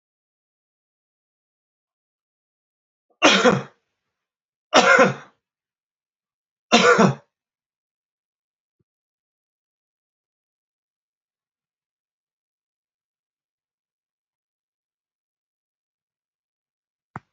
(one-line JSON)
{"three_cough_length": "17.3 s", "three_cough_amplitude": 32767, "three_cough_signal_mean_std_ratio": 0.2, "survey_phase": "beta (2021-08-13 to 2022-03-07)", "age": "65+", "gender": "Male", "wearing_mask": "No", "symptom_none": true, "smoker_status": "Ex-smoker", "respiratory_condition_asthma": false, "respiratory_condition_other": false, "recruitment_source": "REACT", "submission_delay": "5 days", "covid_test_result": "Negative", "covid_test_method": "RT-qPCR", "influenza_a_test_result": "Negative", "influenza_b_test_result": "Negative"}